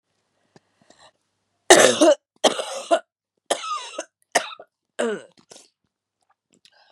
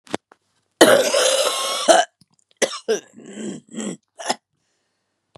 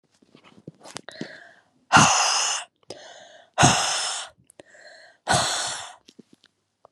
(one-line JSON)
{"three_cough_length": "6.9 s", "three_cough_amplitude": 32767, "three_cough_signal_mean_std_ratio": 0.3, "cough_length": "5.4 s", "cough_amplitude": 32768, "cough_signal_mean_std_ratio": 0.42, "exhalation_length": "6.9 s", "exhalation_amplitude": 29430, "exhalation_signal_mean_std_ratio": 0.4, "survey_phase": "beta (2021-08-13 to 2022-03-07)", "age": "18-44", "gender": "Female", "wearing_mask": "No", "symptom_cough_any": true, "symptom_shortness_of_breath": true, "symptom_sore_throat": true, "symptom_fatigue": true, "symptom_onset": "3 days", "smoker_status": "Never smoked", "respiratory_condition_asthma": false, "respiratory_condition_other": false, "recruitment_source": "Test and Trace", "submission_delay": "2 days", "covid_test_result": "Positive", "covid_test_method": "RT-qPCR", "covid_ct_value": 19.1, "covid_ct_gene": "ORF1ab gene", "covid_ct_mean": 19.5, "covid_viral_load": "390000 copies/ml", "covid_viral_load_category": "Low viral load (10K-1M copies/ml)"}